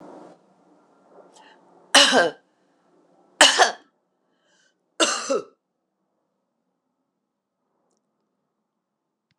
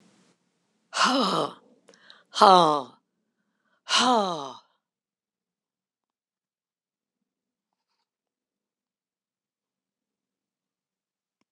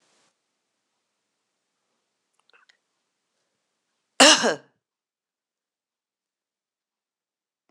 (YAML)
three_cough_length: 9.4 s
three_cough_amplitude: 26028
three_cough_signal_mean_std_ratio: 0.24
exhalation_length: 11.5 s
exhalation_amplitude: 25795
exhalation_signal_mean_std_ratio: 0.24
cough_length: 7.7 s
cough_amplitude: 26028
cough_signal_mean_std_ratio: 0.14
survey_phase: beta (2021-08-13 to 2022-03-07)
age: 65+
gender: Female
wearing_mask: 'No'
symptom_cough_any: true
symptom_new_continuous_cough: true
symptom_sore_throat: true
symptom_headache: true
symptom_onset: 2 days
smoker_status: Ex-smoker
respiratory_condition_asthma: false
respiratory_condition_other: false
recruitment_source: Test and Trace
submission_delay: 1 day
covid_test_result: Positive
covid_test_method: RT-qPCR
covid_ct_value: 19.5
covid_ct_gene: N gene